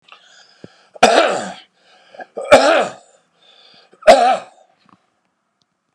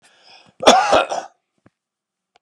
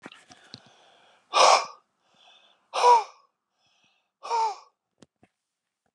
three_cough_length: 5.9 s
three_cough_amplitude: 32768
three_cough_signal_mean_std_ratio: 0.35
cough_length: 2.4 s
cough_amplitude: 32768
cough_signal_mean_std_ratio: 0.34
exhalation_length: 5.9 s
exhalation_amplitude: 18988
exhalation_signal_mean_std_ratio: 0.3
survey_phase: beta (2021-08-13 to 2022-03-07)
age: 65+
gender: Male
wearing_mask: 'No'
symptom_none: true
smoker_status: Ex-smoker
respiratory_condition_asthma: true
respiratory_condition_other: false
recruitment_source: Test and Trace
submission_delay: 1 day
covid_test_result: Positive
covid_test_method: RT-qPCR
covid_ct_value: 25.1
covid_ct_gene: N gene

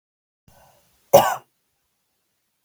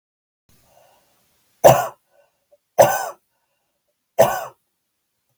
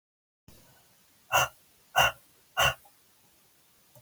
cough_length: 2.6 s
cough_amplitude: 32768
cough_signal_mean_std_ratio: 0.2
three_cough_length: 5.4 s
three_cough_amplitude: 32768
three_cough_signal_mean_std_ratio: 0.25
exhalation_length: 4.0 s
exhalation_amplitude: 11410
exhalation_signal_mean_std_ratio: 0.29
survey_phase: beta (2021-08-13 to 2022-03-07)
age: 18-44
gender: Female
wearing_mask: 'No'
symptom_none: true
smoker_status: Never smoked
respiratory_condition_asthma: false
respiratory_condition_other: false
recruitment_source: REACT
submission_delay: 1 day
covid_test_result: Negative
covid_test_method: RT-qPCR
influenza_a_test_result: Negative
influenza_b_test_result: Negative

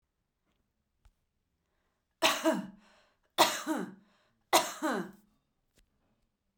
three_cough_length: 6.6 s
three_cough_amplitude: 11916
three_cough_signal_mean_std_ratio: 0.31
survey_phase: beta (2021-08-13 to 2022-03-07)
age: 45-64
gender: Female
wearing_mask: 'No'
symptom_none: true
smoker_status: Never smoked
respiratory_condition_asthma: false
respiratory_condition_other: false
recruitment_source: REACT
submission_delay: 2 days
covid_test_result: Negative
covid_test_method: RT-qPCR
influenza_a_test_result: Negative
influenza_b_test_result: Negative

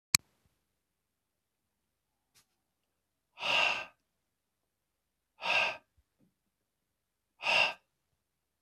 exhalation_length: 8.6 s
exhalation_amplitude: 21509
exhalation_signal_mean_std_ratio: 0.26
survey_phase: beta (2021-08-13 to 2022-03-07)
age: 45-64
gender: Male
wearing_mask: 'No'
symptom_none: true
smoker_status: Never smoked
respiratory_condition_asthma: false
respiratory_condition_other: false
recruitment_source: REACT
submission_delay: 1 day
covid_test_result: Negative
covid_test_method: RT-qPCR
influenza_a_test_result: Negative
influenza_b_test_result: Negative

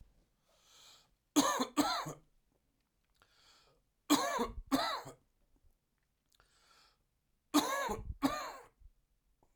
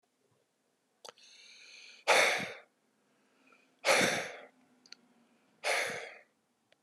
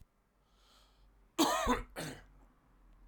three_cough_length: 9.6 s
three_cough_amplitude: 5866
three_cough_signal_mean_std_ratio: 0.37
exhalation_length: 6.8 s
exhalation_amplitude: 7934
exhalation_signal_mean_std_ratio: 0.34
cough_length: 3.1 s
cough_amplitude: 4620
cough_signal_mean_std_ratio: 0.37
survey_phase: alpha (2021-03-01 to 2021-08-12)
age: 45-64
gender: Male
wearing_mask: 'No'
symptom_cough_any: true
symptom_fatigue: true
symptom_headache: true
symptom_change_to_sense_of_smell_or_taste: true
symptom_loss_of_taste: true
symptom_onset: 5 days
smoker_status: Ex-smoker
respiratory_condition_asthma: false
respiratory_condition_other: false
recruitment_source: Test and Trace
submission_delay: 2 days
covid_test_result: Positive
covid_test_method: RT-qPCR
covid_ct_value: 15.1
covid_ct_gene: ORF1ab gene
covid_ct_mean: 15.5
covid_viral_load: 8100000 copies/ml
covid_viral_load_category: High viral load (>1M copies/ml)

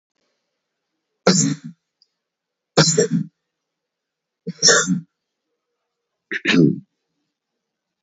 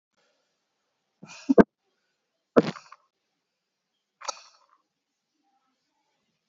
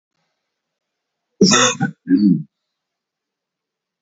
three_cough_length: 8.0 s
three_cough_amplitude: 28723
three_cough_signal_mean_std_ratio: 0.33
exhalation_length: 6.5 s
exhalation_amplitude: 27329
exhalation_signal_mean_std_ratio: 0.13
cough_length: 4.0 s
cough_amplitude: 31091
cough_signal_mean_std_ratio: 0.35
survey_phase: beta (2021-08-13 to 2022-03-07)
age: 18-44
gender: Male
wearing_mask: 'No'
symptom_cough_any: true
symptom_runny_or_blocked_nose: true
symptom_sore_throat: true
symptom_fatigue: true
symptom_fever_high_temperature: true
symptom_change_to_sense_of_smell_or_taste: true
symptom_onset: 4 days
smoker_status: Never smoked
respiratory_condition_asthma: false
respiratory_condition_other: false
recruitment_source: Test and Trace
submission_delay: 2 days
covid_test_result: Positive
covid_test_method: RT-qPCR
covid_ct_value: 14.8
covid_ct_gene: N gene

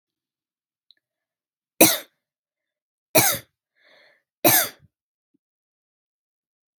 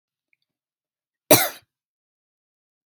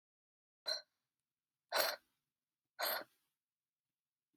three_cough_length: 6.8 s
three_cough_amplitude: 32767
three_cough_signal_mean_std_ratio: 0.22
cough_length: 2.9 s
cough_amplitude: 32768
cough_signal_mean_std_ratio: 0.17
exhalation_length: 4.4 s
exhalation_amplitude: 3258
exhalation_signal_mean_std_ratio: 0.28
survey_phase: beta (2021-08-13 to 2022-03-07)
age: 18-44
gender: Female
wearing_mask: 'No'
symptom_diarrhoea: true
symptom_fatigue: true
smoker_status: Ex-smoker
respiratory_condition_asthma: false
respiratory_condition_other: false
recruitment_source: REACT
submission_delay: 1 day
covid_test_result: Negative
covid_test_method: RT-qPCR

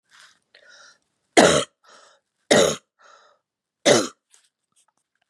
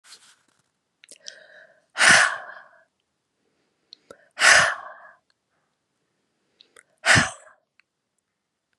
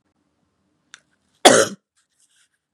three_cough_length: 5.3 s
three_cough_amplitude: 32767
three_cough_signal_mean_std_ratio: 0.28
exhalation_length: 8.8 s
exhalation_amplitude: 31371
exhalation_signal_mean_std_ratio: 0.26
cough_length: 2.7 s
cough_amplitude: 32768
cough_signal_mean_std_ratio: 0.21
survey_phase: beta (2021-08-13 to 2022-03-07)
age: 18-44
gender: Female
wearing_mask: 'No'
symptom_none: true
symptom_onset: 3 days
smoker_status: Never smoked
respiratory_condition_asthma: false
respiratory_condition_other: false
recruitment_source: Test and Trace
submission_delay: 2 days
covid_test_result: Positive
covid_test_method: RT-qPCR
covid_ct_value: 16.0
covid_ct_gene: ORF1ab gene
covid_ct_mean: 16.1
covid_viral_load: 5300000 copies/ml
covid_viral_load_category: High viral load (>1M copies/ml)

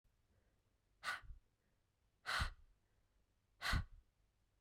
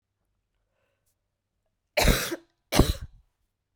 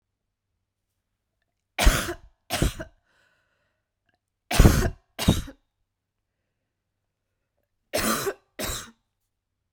exhalation_length: 4.6 s
exhalation_amplitude: 1399
exhalation_signal_mean_std_ratio: 0.32
cough_length: 3.8 s
cough_amplitude: 18646
cough_signal_mean_std_ratio: 0.28
three_cough_length: 9.7 s
three_cough_amplitude: 32767
three_cough_signal_mean_std_ratio: 0.27
survey_phase: beta (2021-08-13 to 2022-03-07)
age: 18-44
gender: Female
wearing_mask: 'No'
symptom_cough_any: true
symptom_new_continuous_cough: true
symptom_runny_or_blocked_nose: true
symptom_shortness_of_breath: true
symptom_fatigue: true
symptom_onset: 4 days
smoker_status: Never smoked
respiratory_condition_asthma: false
respiratory_condition_other: false
recruitment_source: Test and Trace
submission_delay: 2 days
covid_test_result: Positive
covid_test_method: RT-qPCR
covid_ct_value: 31.6
covid_ct_gene: ORF1ab gene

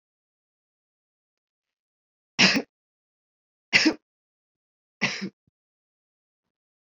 three_cough_length: 6.9 s
three_cough_amplitude: 21174
three_cough_signal_mean_std_ratio: 0.21
survey_phase: beta (2021-08-13 to 2022-03-07)
age: 65+
gender: Female
wearing_mask: 'No'
symptom_none: true
smoker_status: Never smoked
respiratory_condition_asthma: false
respiratory_condition_other: false
recruitment_source: REACT
submission_delay: 1 day
covid_test_result: Negative
covid_test_method: RT-qPCR
influenza_a_test_result: Negative
influenza_b_test_result: Negative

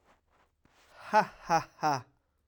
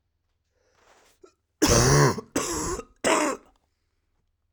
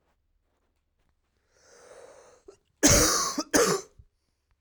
exhalation_length: 2.5 s
exhalation_amplitude: 9381
exhalation_signal_mean_std_ratio: 0.35
three_cough_length: 4.5 s
three_cough_amplitude: 16738
three_cough_signal_mean_std_ratio: 0.42
cough_length: 4.6 s
cough_amplitude: 19765
cough_signal_mean_std_ratio: 0.34
survey_phase: alpha (2021-03-01 to 2021-08-12)
age: 18-44
gender: Male
wearing_mask: 'No'
symptom_cough_any: true
symptom_fever_high_temperature: true
symptom_onset: 2 days
smoker_status: Current smoker (1 to 10 cigarettes per day)
respiratory_condition_asthma: false
respiratory_condition_other: false
recruitment_source: Test and Trace
submission_delay: 1 day
covid_test_result: Positive
covid_test_method: RT-qPCR
covid_ct_value: 15.8
covid_ct_gene: ORF1ab gene
covid_ct_mean: 16.4
covid_viral_load: 4200000 copies/ml
covid_viral_load_category: High viral load (>1M copies/ml)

